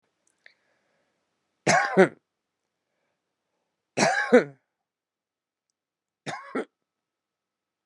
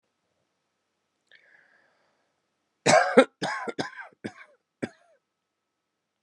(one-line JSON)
{"three_cough_length": "7.9 s", "three_cough_amplitude": 22535, "three_cough_signal_mean_std_ratio": 0.24, "cough_length": "6.2 s", "cough_amplitude": 25025, "cough_signal_mean_std_ratio": 0.23, "survey_phase": "beta (2021-08-13 to 2022-03-07)", "age": "18-44", "gender": "Female", "wearing_mask": "No", "symptom_cough_any": true, "symptom_runny_or_blocked_nose": true, "symptom_sore_throat": true, "symptom_fatigue": true, "symptom_change_to_sense_of_smell_or_taste": true, "symptom_onset": "4 days", "smoker_status": "Current smoker (11 or more cigarettes per day)", "respiratory_condition_asthma": true, "respiratory_condition_other": false, "recruitment_source": "Test and Trace", "submission_delay": "1 day", "covid_test_result": "Negative", "covid_test_method": "ePCR"}